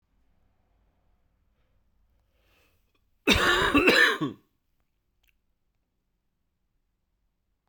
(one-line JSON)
{"cough_length": "7.7 s", "cough_amplitude": 16715, "cough_signal_mean_std_ratio": 0.28, "survey_phase": "beta (2021-08-13 to 2022-03-07)", "age": "18-44", "gender": "Male", "wearing_mask": "No", "symptom_cough_any": true, "symptom_runny_or_blocked_nose": true, "symptom_fatigue": true, "symptom_fever_high_temperature": true, "symptom_change_to_sense_of_smell_or_taste": true, "symptom_loss_of_taste": true, "symptom_onset": "3 days", "smoker_status": "Never smoked", "respiratory_condition_asthma": true, "respiratory_condition_other": false, "recruitment_source": "Test and Trace", "submission_delay": "2 days", "covid_test_result": "Positive", "covid_test_method": "RT-qPCR", "covid_ct_value": 14.8, "covid_ct_gene": "N gene", "covid_ct_mean": 15.9, "covid_viral_load": "6200000 copies/ml", "covid_viral_load_category": "High viral load (>1M copies/ml)"}